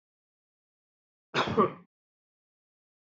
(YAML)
cough_length: 3.1 s
cough_amplitude: 9963
cough_signal_mean_std_ratio: 0.24
survey_phase: beta (2021-08-13 to 2022-03-07)
age: 45-64
gender: Male
wearing_mask: 'No'
symptom_none: true
smoker_status: Current smoker (1 to 10 cigarettes per day)
respiratory_condition_asthma: false
respiratory_condition_other: false
recruitment_source: REACT
submission_delay: 1 day
covid_test_result: Negative
covid_test_method: RT-qPCR
influenza_a_test_result: Negative
influenza_b_test_result: Negative